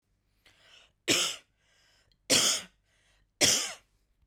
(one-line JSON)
{"three_cough_length": "4.3 s", "three_cough_amplitude": 11270, "three_cough_signal_mean_std_ratio": 0.36, "survey_phase": "beta (2021-08-13 to 2022-03-07)", "age": "18-44", "gender": "Female", "wearing_mask": "No", "symptom_none": true, "smoker_status": "Ex-smoker", "respiratory_condition_asthma": false, "respiratory_condition_other": false, "recruitment_source": "REACT", "submission_delay": "1 day", "covid_test_result": "Negative", "covid_test_method": "RT-qPCR"}